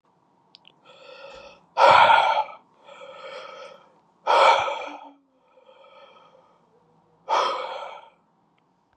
{"exhalation_length": "9.0 s", "exhalation_amplitude": 25820, "exhalation_signal_mean_std_ratio": 0.36, "survey_phase": "beta (2021-08-13 to 2022-03-07)", "age": "18-44", "gender": "Male", "wearing_mask": "No", "symptom_cough_any": true, "symptom_runny_or_blocked_nose": true, "smoker_status": "Current smoker (e-cigarettes or vapes only)", "respiratory_condition_asthma": false, "respiratory_condition_other": false, "recruitment_source": "REACT", "submission_delay": "7 days", "covid_test_result": "Negative", "covid_test_method": "RT-qPCR"}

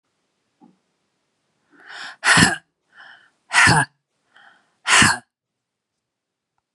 {"exhalation_length": "6.7 s", "exhalation_amplitude": 32766, "exhalation_signal_mean_std_ratio": 0.3, "survey_phase": "beta (2021-08-13 to 2022-03-07)", "age": "45-64", "gender": "Female", "wearing_mask": "No", "symptom_cough_any": true, "symptom_runny_or_blocked_nose": true, "symptom_sore_throat": true, "symptom_fatigue": true, "symptom_headache": true, "symptom_onset": "3 days", "smoker_status": "Ex-smoker", "respiratory_condition_asthma": true, "respiratory_condition_other": false, "recruitment_source": "Test and Trace", "submission_delay": "2 days", "covid_test_result": "Negative", "covid_test_method": "RT-qPCR"}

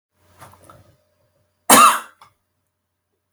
{"cough_length": "3.3 s", "cough_amplitude": 32768, "cough_signal_mean_std_ratio": 0.24, "survey_phase": "alpha (2021-03-01 to 2021-08-12)", "age": "65+", "gender": "Male", "wearing_mask": "No", "symptom_none": true, "smoker_status": "Ex-smoker", "respiratory_condition_asthma": false, "respiratory_condition_other": false, "recruitment_source": "REACT", "submission_delay": "4 days", "covid_test_result": "Negative", "covid_test_method": "RT-qPCR"}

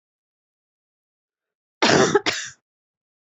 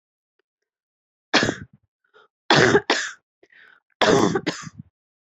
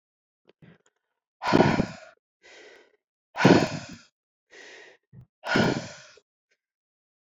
{"cough_length": "3.3 s", "cough_amplitude": 26105, "cough_signal_mean_std_ratio": 0.3, "three_cough_length": "5.4 s", "three_cough_amplitude": 29979, "three_cough_signal_mean_std_ratio": 0.36, "exhalation_length": "7.3 s", "exhalation_amplitude": 22930, "exhalation_signal_mean_std_ratio": 0.3, "survey_phase": "beta (2021-08-13 to 2022-03-07)", "age": "45-64", "gender": "Female", "wearing_mask": "No", "symptom_cough_any": true, "symptom_runny_or_blocked_nose": true, "symptom_diarrhoea": true, "symptom_fatigue": true, "symptom_fever_high_temperature": true, "symptom_headache": true, "symptom_change_to_sense_of_smell_or_taste": true, "symptom_other": true, "symptom_onset": "4 days", "smoker_status": "Ex-smoker", "respiratory_condition_asthma": false, "respiratory_condition_other": false, "recruitment_source": "Test and Trace", "submission_delay": "2 days", "covid_test_result": "Positive", "covid_test_method": "RT-qPCR", "covid_ct_value": 15.6, "covid_ct_gene": "ORF1ab gene", "covid_ct_mean": 15.8, "covid_viral_load": "6800000 copies/ml", "covid_viral_load_category": "High viral load (>1M copies/ml)"}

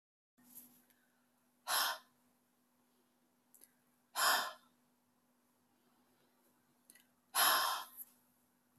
{"exhalation_length": "8.8 s", "exhalation_amplitude": 3924, "exhalation_signal_mean_std_ratio": 0.3, "survey_phase": "beta (2021-08-13 to 2022-03-07)", "age": "65+", "gender": "Female", "wearing_mask": "No", "symptom_none": true, "smoker_status": "Ex-smoker", "respiratory_condition_asthma": false, "respiratory_condition_other": false, "recruitment_source": "REACT", "submission_delay": "1 day", "covid_test_result": "Negative", "covid_test_method": "RT-qPCR"}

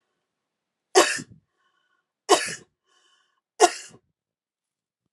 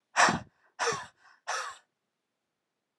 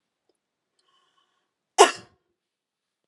{"three_cough_length": "5.1 s", "three_cough_amplitude": 27955, "three_cough_signal_mean_std_ratio": 0.22, "exhalation_length": "3.0 s", "exhalation_amplitude": 11402, "exhalation_signal_mean_std_ratio": 0.33, "cough_length": "3.1 s", "cough_amplitude": 30974, "cough_signal_mean_std_ratio": 0.14, "survey_phase": "alpha (2021-03-01 to 2021-08-12)", "age": "18-44", "gender": "Female", "wearing_mask": "No", "symptom_fatigue": true, "smoker_status": "Never smoked", "respiratory_condition_asthma": false, "respiratory_condition_other": false, "recruitment_source": "Test and Trace", "submission_delay": "1 day", "covid_test_result": "Positive", "covid_test_method": "LAMP"}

